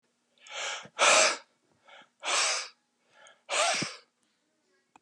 {"exhalation_length": "5.0 s", "exhalation_amplitude": 12084, "exhalation_signal_mean_std_ratio": 0.41, "survey_phase": "beta (2021-08-13 to 2022-03-07)", "age": "65+", "gender": "Male", "wearing_mask": "No", "symptom_runny_or_blocked_nose": true, "smoker_status": "Ex-smoker", "respiratory_condition_asthma": false, "respiratory_condition_other": true, "recruitment_source": "REACT", "submission_delay": "3 days", "covid_test_result": "Negative", "covid_test_method": "RT-qPCR", "influenza_a_test_result": "Negative", "influenza_b_test_result": "Negative"}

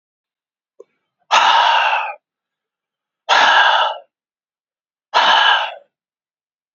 {"exhalation_length": "6.7 s", "exhalation_amplitude": 31393, "exhalation_signal_mean_std_ratio": 0.46, "survey_phase": "beta (2021-08-13 to 2022-03-07)", "age": "45-64", "gender": "Male", "wearing_mask": "No", "symptom_runny_or_blocked_nose": true, "symptom_fatigue": true, "smoker_status": "Ex-smoker", "respiratory_condition_asthma": false, "respiratory_condition_other": false, "recruitment_source": "Test and Trace", "submission_delay": "1 day", "covid_test_result": "Positive", "covid_test_method": "RT-qPCR", "covid_ct_value": 25.2, "covid_ct_gene": "N gene"}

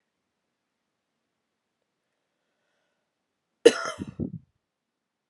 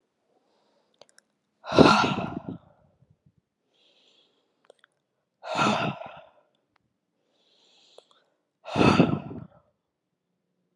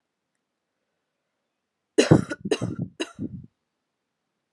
{"cough_length": "5.3 s", "cough_amplitude": 31983, "cough_signal_mean_std_ratio": 0.13, "exhalation_length": "10.8 s", "exhalation_amplitude": 29156, "exhalation_signal_mean_std_ratio": 0.27, "three_cough_length": "4.5 s", "three_cough_amplitude": 28535, "three_cough_signal_mean_std_ratio": 0.24, "survey_phase": "alpha (2021-03-01 to 2021-08-12)", "age": "18-44", "gender": "Female", "wearing_mask": "No", "symptom_cough_any": true, "symptom_headache": true, "symptom_onset": "2 days", "smoker_status": "Never smoked", "respiratory_condition_asthma": false, "respiratory_condition_other": false, "recruitment_source": "Test and Trace", "submission_delay": "1 day", "covid_test_result": "Positive", "covid_test_method": "RT-qPCR", "covid_ct_value": 22.3, "covid_ct_gene": "ORF1ab gene", "covid_ct_mean": 23.1, "covid_viral_load": "27000 copies/ml", "covid_viral_load_category": "Low viral load (10K-1M copies/ml)"}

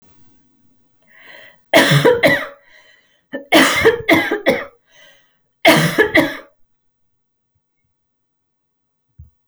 {"three_cough_length": "9.5 s", "three_cough_amplitude": 32768, "three_cough_signal_mean_std_ratio": 0.39, "survey_phase": "alpha (2021-03-01 to 2021-08-12)", "age": "18-44", "gender": "Female", "wearing_mask": "No", "symptom_none": true, "smoker_status": "Never smoked", "respiratory_condition_asthma": false, "respiratory_condition_other": false, "recruitment_source": "REACT", "submission_delay": "1 day", "covid_test_result": "Negative", "covid_test_method": "RT-qPCR"}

